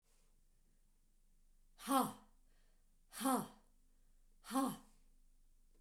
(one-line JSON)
{"exhalation_length": "5.8 s", "exhalation_amplitude": 2976, "exhalation_signal_mean_std_ratio": 0.34, "survey_phase": "beta (2021-08-13 to 2022-03-07)", "age": "65+", "gender": "Female", "wearing_mask": "No", "symptom_none": true, "smoker_status": "Never smoked", "respiratory_condition_asthma": false, "respiratory_condition_other": false, "recruitment_source": "REACT", "submission_delay": "2 days", "covid_test_result": "Negative", "covid_test_method": "RT-qPCR", "influenza_a_test_result": "Negative", "influenza_b_test_result": "Negative"}